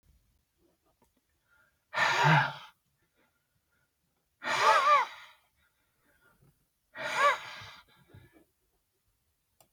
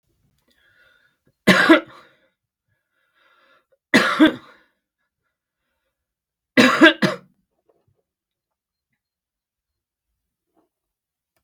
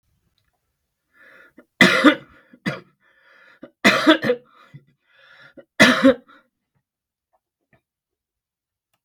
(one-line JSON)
{"exhalation_length": "9.7 s", "exhalation_amplitude": 9674, "exhalation_signal_mean_std_ratio": 0.33, "three_cough_length": "11.4 s", "three_cough_amplitude": 32768, "three_cough_signal_mean_std_ratio": 0.24, "cough_length": "9.0 s", "cough_amplitude": 32768, "cough_signal_mean_std_ratio": 0.27, "survey_phase": "beta (2021-08-13 to 2022-03-07)", "age": "65+", "gender": "Male", "wearing_mask": "No", "symptom_none": true, "smoker_status": "Never smoked", "respiratory_condition_asthma": false, "respiratory_condition_other": false, "recruitment_source": "REACT", "submission_delay": "0 days", "covid_test_result": "Negative", "covid_test_method": "RT-qPCR", "influenza_a_test_result": "Negative", "influenza_b_test_result": "Negative"}